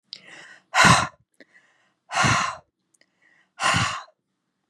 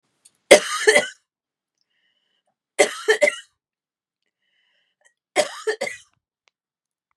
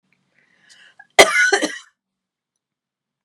exhalation_length: 4.7 s
exhalation_amplitude: 24785
exhalation_signal_mean_std_ratio: 0.38
three_cough_length: 7.2 s
three_cough_amplitude: 32768
three_cough_signal_mean_std_ratio: 0.26
cough_length: 3.2 s
cough_amplitude: 32768
cough_signal_mean_std_ratio: 0.27
survey_phase: beta (2021-08-13 to 2022-03-07)
age: 45-64
gender: Female
wearing_mask: 'No'
symptom_cough_any: true
symptom_sore_throat: true
symptom_headache: true
symptom_onset: 5 days
smoker_status: Never smoked
respiratory_condition_asthma: false
respiratory_condition_other: false
recruitment_source: Test and Trace
submission_delay: 1 day
covid_test_result: Negative
covid_test_method: RT-qPCR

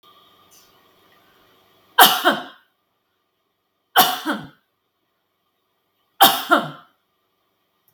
three_cough_length: 7.9 s
three_cough_amplitude: 32768
three_cough_signal_mean_std_ratio: 0.27
survey_phase: beta (2021-08-13 to 2022-03-07)
age: 45-64
gender: Female
wearing_mask: 'No'
symptom_none: true
smoker_status: Never smoked
respiratory_condition_asthma: false
respiratory_condition_other: false
recruitment_source: REACT
submission_delay: 1 day
covid_test_result: Negative
covid_test_method: RT-qPCR
influenza_a_test_result: Negative
influenza_b_test_result: Negative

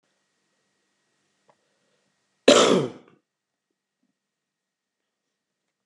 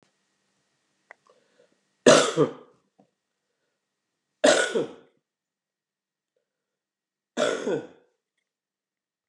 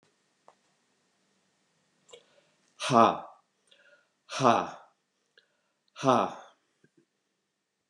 cough_length: 5.9 s
cough_amplitude: 27669
cough_signal_mean_std_ratio: 0.19
three_cough_length: 9.3 s
three_cough_amplitude: 30115
three_cough_signal_mean_std_ratio: 0.25
exhalation_length: 7.9 s
exhalation_amplitude: 15389
exhalation_signal_mean_std_ratio: 0.25
survey_phase: beta (2021-08-13 to 2022-03-07)
age: 65+
gender: Male
wearing_mask: 'No'
symptom_new_continuous_cough: true
symptom_sore_throat: true
symptom_fatigue: true
symptom_fever_high_temperature: true
symptom_onset: 5 days
smoker_status: Never smoked
respiratory_condition_asthma: false
respiratory_condition_other: false
recruitment_source: Test and Trace
submission_delay: 2 days
covid_test_result: Positive
covid_test_method: RT-qPCR
covid_ct_value: 15.1
covid_ct_gene: ORF1ab gene
covid_ct_mean: 15.5
covid_viral_load: 8300000 copies/ml
covid_viral_load_category: High viral load (>1M copies/ml)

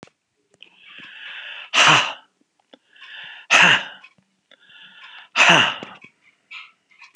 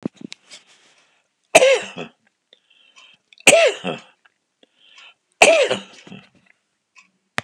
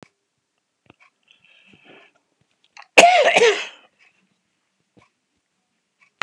exhalation_length: 7.2 s
exhalation_amplitude: 32392
exhalation_signal_mean_std_ratio: 0.34
three_cough_length: 7.4 s
three_cough_amplitude: 32768
three_cough_signal_mean_std_ratio: 0.29
cough_length: 6.2 s
cough_amplitude: 32768
cough_signal_mean_std_ratio: 0.25
survey_phase: beta (2021-08-13 to 2022-03-07)
age: 65+
gender: Male
wearing_mask: 'No'
symptom_cough_any: true
symptom_other: true
smoker_status: Never smoked
respiratory_condition_asthma: false
respiratory_condition_other: false
recruitment_source: REACT
submission_delay: 2 days
covid_test_result: Negative
covid_test_method: RT-qPCR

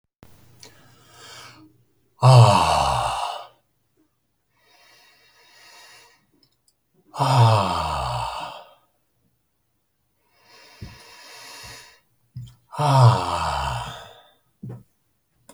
exhalation_length: 15.5 s
exhalation_amplitude: 27339
exhalation_signal_mean_std_ratio: 0.36
survey_phase: alpha (2021-03-01 to 2021-08-12)
age: 45-64
gender: Male
wearing_mask: 'No'
symptom_none: true
smoker_status: Never smoked
respiratory_condition_asthma: false
respiratory_condition_other: false
recruitment_source: REACT
submission_delay: 1 day
covid_test_result: Negative
covid_test_method: RT-qPCR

